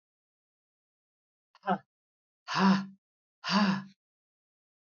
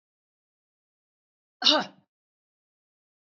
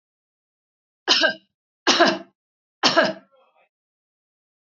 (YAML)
exhalation_length: 4.9 s
exhalation_amplitude: 7296
exhalation_signal_mean_std_ratio: 0.32
cough_length: 3.3 s
cough_amplitude: 20067
cough_signal_mean_std_ratio: 0.18
three_cough_length: 4.6 s
three_cough_amplitude: 27555
three_cough_signal_mean_std_ratio: 0.32
survey_phase: beta (2021-08-13 to 2022-03-07)
age: 65+
gender: Female
wearing_mask: 'No'
symptom_none: true
smoker_status: Never smoked
respiratory_condition_asthma: false
respiratory_condition_other: false
recruitment_source: REACT
submission_delay: 1 day
covid_test_result: Negative
covid_test_method: RT-qPCR
influenza_a_test_result: Negative
influenza_b_test_result: Negative